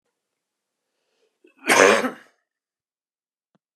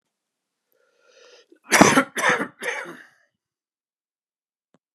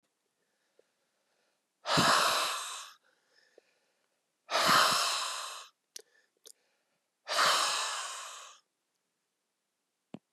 {"cough_length": "3.8 s", "cough_amplitude": 32767, "cough_signal_mean_std_ratio": 0.25, "three_cough_length": "4.9 s", "three_cough_amplitude": 32768, "three_cough_signal_mean_std_ratio": 0.28, "exhalation_length": "10.3 s", "exhalation_amplitude": 8585, "exhalation_signal_mean_std_ratio": 0.41, "survey_phase": "beta (2021-08-13 to 2022-03-07)", "age": "45-64", "gender": "Male", "wearing_mask": "No", "symptom_cough_any": true, "symptom_runny_or_blocked_nose": true, "symptom_sore_throat": true, "symptom_headache": true, "smoker_status": "Never smoked", "respiratory_condition_asthma": false, "respiratory_condition_other": false, "recruitment_source": "Test and Trace", "submission_delay": "2 days", "covid_test_result": "Positive", "covid_test_method": "RT-qPCR", "covid_ct_value": 19.8, "covid_ct_gene": "ORF1ab gene", "covid_ct_mean": 20.4, "covid_viral_load": "210000 copies/ml", "covid_viral_load_category": "Low viral load (10K-1M copies/ml)"}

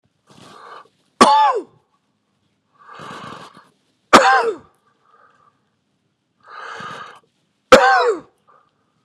{"three_cough_length": "9.0 s", "three_cough_amplitude": 32768, "three_cough_signal_mean_std_ratio": 0.31, "survey_phase": "beta (2021-08-13 to 2022-03-07)", "age": "45-64", "gender": "Male", "wearing_mask": "No", "symptom_cough_any": true, "symptom_runny_or_blocked_nose": true, "symptom_shortness_of_breath": true, "symptom_fatigue": true, "symptom_onset": "3 days", "smoker_status": "Never smoked", "respiratory_condition_asthma": true, "respiratory_condition_other": false, "recruitment_source": "Test and Trace", "submission_delay": "1 day", "covid_test_result": "Positive", "covid_test_method": "RT-qPCR", "covid_ct_value": 19.5, "covid_ct_gene": "ORF1ab gene", "covid_ct_mean": 19.6, "covid_viral_load": "360000 copies/ml", "covid_viral_load_category": "Low viral load (10K-1M copies/ml)"}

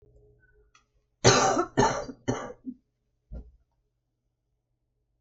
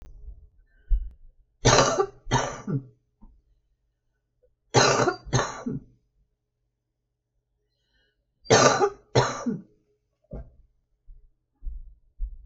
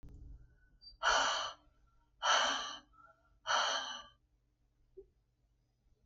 {"cough_length": "5.2 s", "cough_amplitude": 20806, "cough_signal_mean_std_ratio": 0.31, "three_cough_length": "12.5 s", "three_cough_amplitude": 31377, "three_cough_signal_mean_std_ratio": 0.36, "exhalation_length": "6.1 s", "exhalation_amplitude": 4586, "exhalation_signal_mean_std_ratio": 0.42, "survey_phase": "beta (2021-08-13 to 2022-03-07)", "age": "65+", "gender": "Female", "wearing_mask": "No", "symptom_none": true, "smoker_status": "Never smoked", "respiratory_condition_asthma": true, "respiratory_condition_other": true, "recruitment_source": "REACT", "submission_delay": "2 days", "covid_test_result": "Negative", "covid_test_method": "RT-qPCR", "influenza_a_test_result": "Negative", "influenza_b_test_result": "Negative"}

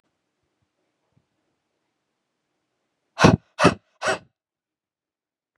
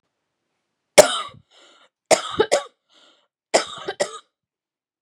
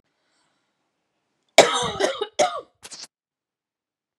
{"exhalation_length": "5.6 s", "exhalation_amplitude": 31023, "exhalation_signal_mean_std_ratio": 0.19, "three_cough_length": "5.0 s", "three_cough_amplitude": 32768, "three_cough_signal_mean_std_ratio": 0.25, "cough_length": "4.2 s", "cough_amplitude": 32768, "cough_signal_mean_std_ratio": 0.27, "survey_phase": "beta (2021-08-13 to 2022-03-07)", "age": "18-44", "gender": "Female", "wearing_mask": "No", "symptom_runny_or_blocked_nose": true, "symptom_fatigue": true, "symptom_headache": true, "smoker_status": "Ex-smoker", "respiratory_condition_asthma": false, "respiratory_condition_other": false, "recruitment_source": "Test and Trace", "submission_delay": "1 day", "covid_test_result": "Negative", "covid_test_method": "RT-qPCR"}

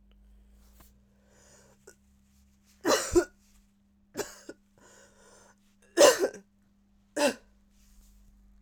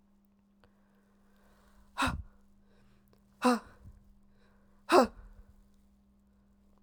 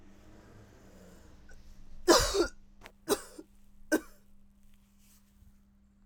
{"three_cough_length": "8.6 s", "three_cough_amplitude": 16585, "three_cough_signal_mean_std_ratio": 0.25, "exhalation_length": "6.8 s", "exhalation_amplitude": 11901, "exhalation_signal_mean_std_ratio": 0.24, "cough_length": "6.1 s", "cough_amplitude": 12777, "cough_signal_mean_std_ratio": 0.31, "survey_phase": "alpha (2021-03-01 to 2021-08-12)", "age": "18-44", "gender": "Female", "wearing_mask": "No", "symptom_abdominal_pain": true, "symptom_fatigue": true, "symptom_fever_high_temperature": true, "symptom_headache": true, "smoker_status": "Ex-smoker", "respiratory_condition_asthma": false, "respiratory_condition_other": false, "recruitment_source": "Test and Trace", "submission_delay": "2 days", "covid_test_result": "Positive", "covid_test_method": "RT-qPCR", "covid_ct_value": 32.2, "covid_ct_gene": "ORF1ab gene"}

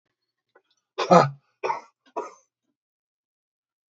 {"exhalation_length": "3.9 s", "exhalation_amplitude": 30131, "exhalation_signal_mean_std_ratio": 0.22, "survey_phase": "beta (2021-08-13 to 2022-03-07)", "age": "65+", "gender": "Male", "wearing_mask": "No", "symptom_none": true, "smoker_status": "Ex-smoker", "respiratory_condition_asthma": false, "respiratory_condition_other": false, "recruitment_source": "REACT", "submission_delay": "1 day", "covid_test_result": "Negative", "covid_test_method": "RT-qPCR"}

